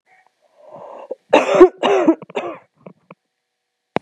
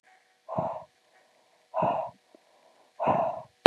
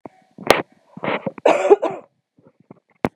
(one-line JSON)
{"three_cough_length": "4.0 s", "three_cough_amplitude": 32768, "three_cough_signal_mean_std_ratio": 0.34, "exhalation_length": "3.7 s", "exhalation_amplitude": 32768, "exhalation_signal_mean_std_ratio": 0.34, "cough_length": "3.2 s", "cough_amplitude": 32768, "cough_signal_mean_std_ratio": 0.33, "survey_phase": "beta (2021-08-13 to 2022-03-07)", "age": "18-44", "gender": "Female", "wearing_mask": "No", "symptom_cough_any": true, "symptom_runny_or_blocked_nose": true, "symptom_shortness_of_breath": true, "symptom_sore_throat": true, "symptom_fatigue": true, "symptom_fever_high_temperature": true, "symptom_headache": true, "symptom_onset": "2 days", "smoker_status": "Never smoked", "respiratory_condition_asthma": true, "respiratory_condition_other": false, "recruitment_source": "Test and Trace", "submission_delay": "2 days", "covid_test_result": "Positive", "covid_test_method": "ePCR"}